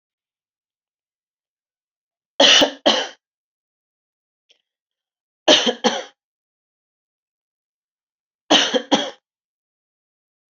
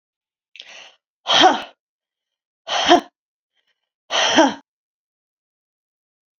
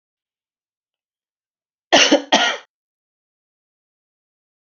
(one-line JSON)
{"three_cough_length": "10.5 s", "three_cough_amplitude": 30610, "three_cough_signal_mean_std_ratio": 0.26, "exhalation_length": "6.4 s", "exhalation_amplitude": 29123, "exhalation_signal_mean_std_ratio": 0.31, "cough_length": "4.6 s", "cough_amplitude": 30437, "cough_signal_mean_std_ratio": 0.25, "survey_phase": "alpha (2021-03-01 to 2021-08-12)", "age": "45-64", "gender": "Female", "wearing_mask": "No", "symptom_none": true, "smoker_status": "Never smoked", "respiratory_condition_asthma": false, "respiratory_condition_other": false, "recruitment_source": "REACT", "submission_delay": "1 day", "covid_test_result": "Negative", "covid_test_method": "RT-qPCR"}